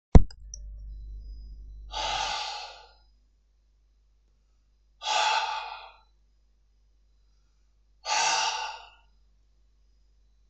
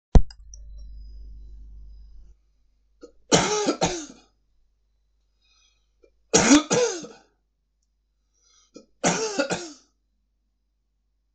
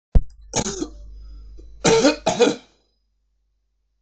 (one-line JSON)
{"exhalation_length": "10.5 s", "exhalation_amplitude": 25879, "exhalation_signal_mean_std_ratio": 0.29, "three_cough_length": "11.3 s", "three_cough_amplitude": 25700, "three_cough_signal_mean_std_ratio": 0.3, "cough_length": "4.0 s", "cough_amplitude": 24527, "cough_signal_mean_std_ratio": 0.4, "survey_phase": "beta (2021-08-13 to 2022-03-07)", "age": "45-64", "gender": "Male", "wearing_mask": "No", "symptom_cough_any": true, "smoker_status": "Never smoked", "respiratory_condition_asthma": false, "respiratory_condition_other": false, "recruitment_source": "REACT", "submission_delay": "2 days", "covid_test_result": "Negative", "covid_test_method": "RT-qPCR", "influenza_a_test_result": "Negative", "influenza_b_test_result": "Negative"}